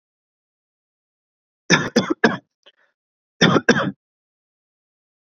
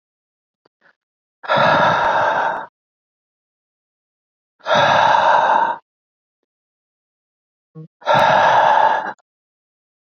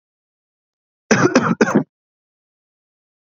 {
  "three_cough_length": "5.3 s",
  "three_cough_amplitude": 32768,
  "three_cough_signal_mean_std_ratio": 0.29,
  "exhalation_length": "10.2 s",
  "exhalation_amplitude": 26574,
  "exhalation_signal_mean_std_ratio": 0.49,
  "cough_length": "3.2 s",
  "cough_amplitude": 29806,
  "cough_signal_mean_std_ratio": 0.33,
  "survey_phase": "beta (2021-08-13 to 2022-03-07)",
  "age": "18-44",
  "gender": "Male",
  "wearing_mask": "No",
  "symptom_sore_throat": true,
  "symptom_fatigue": true,
  "symptom_onset": "8 days",
  "smoker_status": "Never smoked",
  "respiratory_condition_asthma": false,
  "respiratory_condition_other": false,
  "recruitment_source": "Test and Trace",
  "submission_delay": "2 days",
  "covid_test_result": "Positive",
  "covid_test_method": "RT-qPCR",
  "covid_ct_value": 20.1,
  "covid_ct_gene": "ORF1ab gene"
}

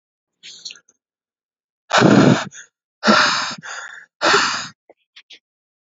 {
  "exhalation_length": "5.8 s",
  "exhalation_amplitude": 32255,
  "exhalation_signal_mean_std_ratio": 0.4,
  "survey_phase": "beta (2021-08-13 to 2022-03-07)",
  "age": "18-44",
  "gender": "Male",
  "wearing_mask": "No",
  "symptom_cough_any": true,
  "symptom_runny_or_blocked_nose": true,
  "symptom_sore_throat": true,
  "smoker_status": "Never smoked",
  "respiratory_condition_asthma": false,
  "respiratory_condition_other": false,
  "recruitment_source": "REACT",
  "submission_delay": "2 days",
  "covid_test_result": "Negative",
  "covid_test_method": "RT-qPCR"
}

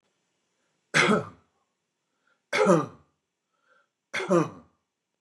{
  "three_cough_length": "5.2 s",
  "three_cough_amplitude": 15661,
  "three_cough_signal_mean_std_ratio": 0.32,
  "survey_phase": "beta (2021-08-13 to 2022-03-07)",
  "age": "65+",
  "gender": "Male",
  "wearing_mask": "No",
  "symptom_none": true,
  "smoker_status": "Ex-smoker",
  "respiratory_condition_asthma": false,
  "respiratory_condition_other": false,
  "recruitment_source": "REACT",
  "submission_delay": "3 days",
  "covid_test_result": "Negative",
  "covid_test_method": "RT-qPCR",
  "influenza_a_test_result": "Negative",
  "influenza_b_test_result": "Negative"
}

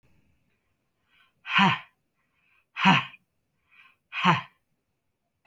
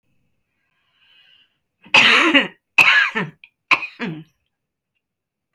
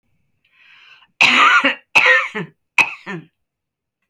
{
  "exhalation_length": "5.5 s",
  "exhalation_amplitude": 16745,
  "exhalation_signal_mean_std_ratio": 0.29,
  "three_cough_length": "5.5 s",
  "three_cough_amplitude": 32767,
  "three_cough_signal_mean_std_ratio": 0.36,
  "cough_length": "4.1 s",
  "cough_amplitude": 32757,
  "cough_signal_mean_std_ratio": 0.42,
  "survey_phase": "alpha (2021-03-01 to 2021-08-12)",
  "age": "65+",
  "gender": "Female",
  "wearing_mask": "No",
  "symptom_none": true,
  "smoker_status": "Never smoked",
  "respiratory_condition_asthma": false,
  "respiratory_condition_other": false,
  "recruitment_source": "REACT",
  "submission_delay": "1 day",
  "covid_test_result": "Negative",
  "covid_test_method": "RT-qPCR"
}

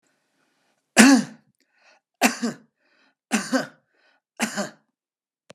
{
  "three_cough_length": "5.5 s",
  "three_cough_amplitude": 32768,
  "three_cough_signal_mean_std_ratio": 0.28,
  "survey_phase": "beta (2021-08-13 to 2022-03-07)",
  "age": "65+",
  "gender": "Male",
  "wearing_mask": "No",
  "symptom_none": true,
  "smoker_status": "Ex-smoker",
  "respiratory_condition_asthma": false,
  "respiratory_condition_other": false,
  "recruitment_source": "REACT",
  "submission_delay": "2 days",
  "covid_test_result": "Negative",
  "covid_test_method": "RT-qPCR"
}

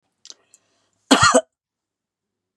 {
  "cough_length": "2.6 s",
  "cough_amplitude": 32767,
  "cough_signal_mean_std_ratio": 0.26,
  "survey_phase": "beta (2021-08-13 to 2022-03-07)",
  "age": "65+",
  "gender": "Female",
  "wearing_mask": "No",
  "symptom_cough_any": true,
  "symptom_runny_or_blocked_nose": true,
  "symptom_sore_throat": true,
  "symptom_headache": true,
  "smoker_status": "Never smoked",
  "respiratory_condition_asthma": false,
  "respiratory_condition_other": false,
  "recruitment_source": "Test and Trace",
  "submission_delay": "1 day",
  "covid_test_result": "Negative",
  "covid_test_method": "RT-qPCR"
}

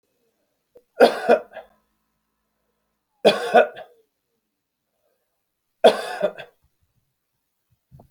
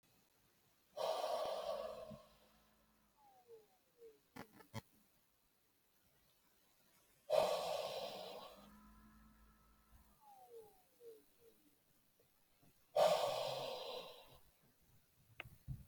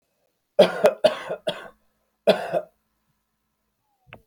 {
  "three_cough_length": "8.1 s",
  "three_cough_amplitude": 27149,
  "three_cough_signal_mean_std_ratio": 0.25,
  "exhalation_length": "15.9 s",
  "exhalation_amplitude": 2958,
  "exhalation_signal_mean_std_ratio": 0.38,
  "cough_length": "4.3 s",
  "cough_amplitude": 22982,
  "cough_signal_mean_std_ratio": 0.3,
  "survey_phase": "alpha (2021-03-01 to 2021-08-12)",
  "age": "45-64",
  "gender": "Male",
  "wearing_mask": "No",
  "symptom_none": true,
  "smoker_status": "Never smoked",
  "respiratory_condition_asthma": true,
  "respiratory_condition_other": false,
  "recruitment_source": "REACT",
  "submission_delay": "3 days",
  "covid_test_result": "Negative",
  "covid_test_method": "RT-qPCR"
}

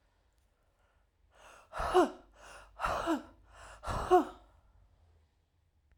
{
  "exhalation_length": "6.0 s",
  "exhalation_amplitude": 8120,
  "exhalation_signal_mean_std_ratio": 0.33,
  "survey_phase": "alpha (2021-03-01 to 2021-08-12)",
  "age": "45-64",
  "gender": "Female",
  "wearing_mask": "No",
  "symptom_none": true,
  "smoker_status": "Prefer not to say",
  "respiratory_condition_asthma": true,
  "respiratory_condition_other": false,
  "recruitment_source": "Test and Trace",
  "submission_delay": "2 days",
  "covid_test_result": "Positive",
  "covid_test_method": "RT-qPCR",
  "covid_ct_value": 12.7,
  "covid_ct_gene": "ORF1ab gene",
  "covid_ct_mean": 13.3,
  "covid_viral_load": "42000000 copies/ml",
  "covid_viral_load_category": "High viral load (>1M copies/ml)"
}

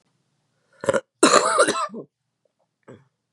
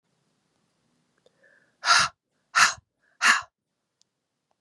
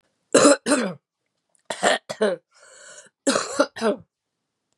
{
  "cough_length": "3.3 s",
  "cough_amplitude": 32768,
  "cough_signal_mean_std_ratio": 0.36,
  "exhalation_length": "4.6 s",
  "exhalation_amplitude": 25105,
  "exhalation_signal_mean_std_ratio": 0.27,
  "three_cough_length": "4.8 s",
  "three_cough_amplitude": 29254,
  "three_cough_signal_mean_std_ratio": 0.4,
  "survey_phase": "beta (2021-08-13 to 2022-03-07)",
  "age": "18-44",
  "gender": "Female",
  "wearing_mask": "No",
  "symptom_cough_any": true,
  "symptom_runny_or_blocked_nose": true,
  "symptom_sore_throat": true,
  "symptom_fatigue": true,
  "symptom_headache": true,
  "smoker_status": "Ex-smoker",
  "respiratory_condition_asthma": false,
  "respiratory_condition_other": false,
  "recruitment_source": "Test and Trace",
  "submission_delay": "1 day",
  "covid_test_result": "Positive",
  "covid_test_method": "RT-qPCR",
  "covid_ct_value": 24.6,
  "covid_ct_gene": "N gene"
}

